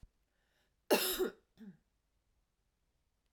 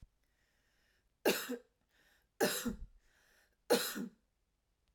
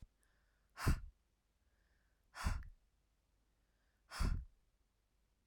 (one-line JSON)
{"cough_length": "3.3 s", "cough_amplitude": 4896, "cough_signal_mean_std_ratio": 0.27, "three_cough_length": "4.9 s", "three_cough_amplitude": 4617, "three_cough_signal_mean_std_ratio": 0.33, "exhalation_length": "5.5 s", "exhalation_amplitude": 1861, "exhalation_signal_mean_std_ratio": 0.3, "survey_phase": "alpha (2021-03-01 to 2021-08-12)", "age": "18-44", "gender": "Female", "wearing_mask": "No", "symptom_none": true, "symptom_onset": "4 days", "smoker_status": "Never smoked", "respiratory_condition_asthma": false, "respiratory_condition_other": false, "recruitment_source": "REACT", "submission_delay": "2 days", "covid_test_result": "Negative", "covid_test_method": "RT-qPCR"}